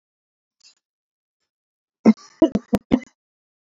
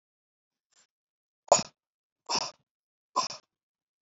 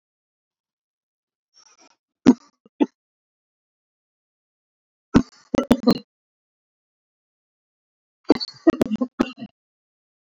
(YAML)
cough_length: 3.7 s
cough_amplitude: 24604
cough_signal_mean_std_ratio: 0.2
exhalation_length: 4.0 s
exhalation_amplitude: 16790
exhalation_signal_mean_std_ratio: 0.2
three_cough_length: 10.3 s
three_cough_amplitude: 26895
three_cough_signal_mean_std_ratio: 0.19
survey_phase: beta (2021-08-13 to 2022-03-07)
age: 18-44
gender: Male
wearing_mask: 'No'
symptom_none: true
smoker_status: Ex-smoker
respiratory_condition_asthma: false
respiratory_condition_other: false
recruitment_source: REACT
submission_delay: 6 days
covid_test_result: Negative
covid_test_method: RT-qPCR
influenza_a_test_result: Negative
influenza_b_test_result: Negative